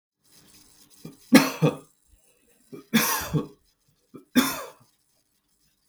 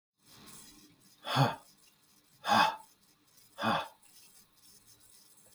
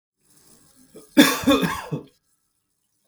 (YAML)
three_cough_length: 5.9 s
three_cough_amplitude: 32767
three_cough_signal_mean_std_ratio: 0.3
exhalation_length: 5.5 s
exhalation_amplitude: 7172
exhalation_signal_mean_std_ratio: 0.33
cough_length: 3.1 s
cough_amplitude: 32768
cough_signal_mean_std_ratio: 0.33
survey_phase: beta (2021-08-13 to 2022-03-07)
age: 45-64
gender: Male
wearing_mask: 'No'
symptom_none: true
smoker_status: Ex-smoker
respiratory_condition_asthma: false
respiratory_condition_other: false
recruitment_source: REACT
submission_delay: 2 days
covid_test_result: Negative
covid_test_method: RT-qPCR